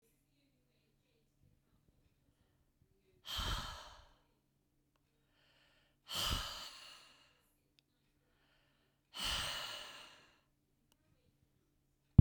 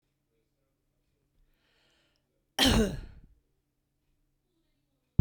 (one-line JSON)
{"exhalation_length": "12.2 s", "exhalation_amplitude": 13208, "exhalation_signal_mean_std_ratio": 0.19, "cough_length": "5.2 s", "cough_amplitude": 12428, "cough_signal_mean_std_ratio": 0.22, "survey_phase": "beta (2021-08-13 to 2022-03-07)", "age": "65+", "gender": "Female", "wearing_mask": "No", "symptom_none": true, "smoker_status": "Never smoked", "respiratory_condition_asthma": false, "respiratory_condition_other": false, "recruitment_source": "Test and Trace", "submission_delay": "2 days", "covid_test_result": "Negative", "covid_test_method": "RT-qPCR"}